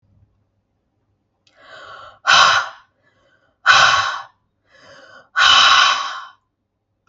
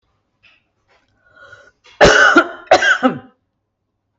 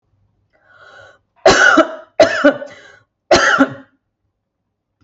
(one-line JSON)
{"exhalation_length": "7.1 s", "exhalation_amplitude": 32768, "exhalation_signal_mean_std_ratio": 0.4, "cough_length": "4.2 s", "cough_amplitude": 32768, "cough_signal_mean_std_ratio": 0.37, "three_cough_length": "5.0 s", "three_cough_amplitude": 32768, "three_cough_signal_mean_std_ratio": 0.39, "survey_phase": "beta (2021-08-13 to 2022-03-07)", "age": "45-64", "gender": "Female", "wearing_mask": "No", "symptom_none": true, "smoker_status": "Never smoked", "respiratory_condition_asthma": false, "respiratory_condition_other": false, "recruitment_source": "REACT", "submission_delay": "1 day", "covid_test_result": "Negative", "covid_test_method": "RT-qPCR", "influenza_a_test_result": "Negative", "influenza_b_test_result": "Negative"}